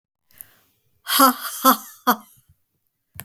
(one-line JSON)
{"exhalation_length": "3.2 s", "exhalation_amplitude": 32768, "exhalation_signal_mean_std_ratio": 0.32, "survey_phase": "beta (2021-08-13 to 2022-03-07)", "age": "65+", "gender": "Female", "wearing_mask": "No", "symptom_none": true, "smoker_status": "Never smoked", "respiratory_condition_asthma": false, "respiratory_condition_other": false, "recruitment_source": "REACT", "submission_delay": "1 day", "covid_test_result": "Negative", "covid_test_method": "RT-qPCR", "influenza_a_test_result": "Unknown/Void", "influenza_b_test_result": "Unknown/Void"}